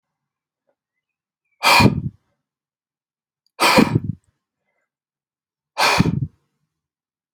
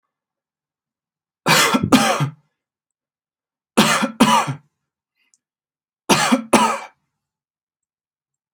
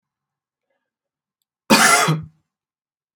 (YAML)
exhalation_length: 7.3 s
exhalation_amplitude: 29057
exhalation_signal_mean_std_ratio: 0.31
three_cough_length: 8.5 s
three_cough_amplitude: 32767
three_cough_signal_mean_std_ratio: 0.37
cough_length: 3.2 s
cough_amplitude: 30237
cough_signal_mean_std_ratio: 0.32
survey_phase: alpha (2021-03-01 to 2021-08-12)
age: 18-44
gender: Male
wearing_mask: 'No'
symptom_none: true
smoker_status: Never smoked
respiratory_condition_asthma: false
respiratory_condition_other: false
recruitment_source: REACT
submission_delay: 2 days
covid_test_result: Negative
covid_test_method: RT-qPCR